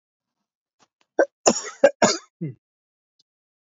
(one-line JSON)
{"cough_length": "3.7 s", "cough_amplitude": 29548, "cough_signal_mean_std_ratio": 0.26, "survey_phase": "beta (2021-08-13 to 2022-03-07)", "age": "45-64", "gender": "Male", "wearing_mask": "Yes", "symptom_none": true, "smoker_status": "Never smoked", "respiratory_condition_asthma": false, "respiratory_condition_other": false, "recruitment_source": "REACT", "submission_delay": "1 day", "covid_test_result": "Negative", "covid_test_method": "RT-qPCR", "influenza_a_test_result": "Unknown/Void", "influenza_b_test_result": "Unknown/Void"}